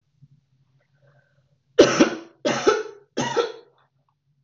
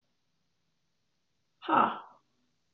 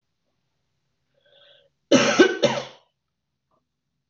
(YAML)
three_cough_length: 4.4 s
three_cough_amplitude: 25803
three_cough_signal_mean_std_ratio: 0.34
exhalation_length: 2.7 s
exhalation_amplitude: 9275
exhalation_signal_mean_std_ratio: 0.25
cough_length: 4.1 s
cough_amplitude: 22999
cough_signal_mean_std_ratio: 0.29
survey_phase: beta (2021-08-13 to 2022-03-07)
age: 45-64
gender: Female
wearing_mask: 'No'
symptom_cough_any: true
symptom_runny_or_blocked_nose: true
symptom_fatigue: true
symptom_headache: true
smoker_status: Never smoked
respiratory_condition_asthma: false
respiratory_condition_other: false
recruitment_source: Test and Trace
submission_delay: 1 day
covid_test_result: Negative
covid_test_method: RT-qPCR